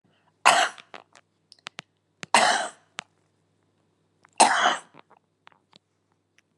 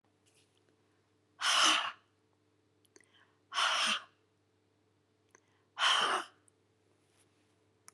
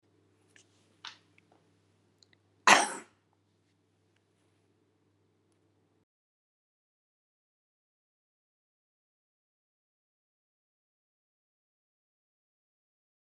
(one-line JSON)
{"three_cough_length": "6.6 s", "three_cough_amplitude": 32676, "three_cough_signal_mean_std_ratio": 0.29, "exhalation_length": "7.9 s", "exhalation_amplitude": 5766, "exhalation_signal_mean_std_ratio": 0.35, "cough_length": "13.4 s", "cough_amplitude": 25210, "cough_signal_mean_std_ratio": 0.1, "survey_phase": "beta (2021-08-13 to 2022-03-07)", "age": "65+", "gender": "Female", "wearing_mask": "No", "symptom_none": true, "smoker_status": "Ex-smoker", "respiratory_condition_asthma": false, "respiratory_condition_other": false, "recruitment_source": "REACT", "submission_delay": "1 day", "covid_test_result": "Negative", "covid_test_method": "RT-qPCR"}